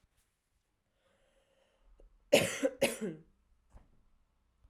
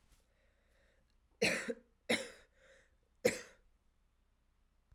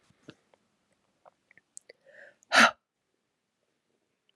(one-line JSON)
{"cough_length": "4.7 s", "cough_amplitude": 9421, "cough_signal_mean_std_ratio": 0.25, "three_cough_length": "4.9 s", "three_cough_amplitude": 4654, "three_cough_signal_mean_std_ratio": 0.27, "exhalation_length": "4.4 s", "exhalation_amplitude": 16708, "exhalation_signal_mean_std_ratio": 0.16, "survey_phase": "alpha (2021-03-01 to 2021-08-12)", "age": "18-44", "gender": "Female", "wearing_mask": "No", "symptom_cough_any": true, "symptom_fever_high_temperature": true, "symptom_headache": true, "smoker_status": "Never smoked", "recruitment_source": "Test and Trace", "submission_delay": "1 day", "covid_test_result": "Positive", "covid_test_method": "RT-qPCR", "covid_ct_value": 20.0, "covid_ct_gene": "ORF1ab gene", "covid_ct_mean": 20.9, "covid_viral_load": "140000 copies/ml", "covid_viral_load_category": "Low viral load (10K-1M copies/ml)"}